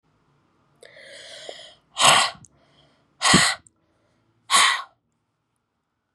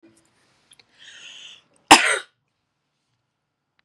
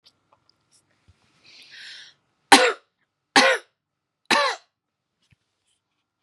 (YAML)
exhalation_length: 6.1 s
exhalation_amplitude: 29178
exhalation_signal_mean_std_ratio: 0.32
cough_length: 3.8 s
cough_amplitude: 32768
cough_signal_mean_std_ratio: 0.18
three_cough_length: 6.2 s
three_cough_amplitude: 32768
three_cough_signal_mean_std_ratio: 0.24
survey_phase: beta (2021-08-13 to 2022-03-07)
age: 18-44
gender: Female
wearing_mask: 'No'
symptom_runny_or_blocked_nose: true
smoker_status: Never smoked
respiratory_condition_asthma: false
respiratory_condition_other: false
recruitment_source: REACT
submission_delay: 4 days
covid_test_result: Negative
covid_test_method: RT-qPCR
influenza_a_test_result: Unknown/Void
influenza_b_test_result: Unknown/Void